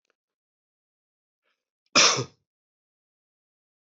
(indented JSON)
{
  "cough_length": "3.8 s",
  "cough_amplitude": 17428,
  "cough_signal_mean_std_ratio": 0.2,
  "survey_phase": "beta (2021-08-13 to 2022-03-07)",
  "age": "45-64",
  "gender": "Male",
  "wearing_mask": "No",
  "symptom_none": true,
  "symptom_onset": "7 days",
  "smoker_status": "Never smoked",
  "respiratory_condition_asthma": false,
  "respiratory_condition_other": false,
  "recruitment_source": "REACT",
  "submission_delay": "2 days",
  "covid_test_result": "Positive",
  "covid_test_method": "RT-qPCR",
  "covid_ct_value": 26.2,
  "covid_ct_gene": "E gene",
  "influenza_a_test_result": "Negative",
  "influenza_b_test_result": "Negative"
}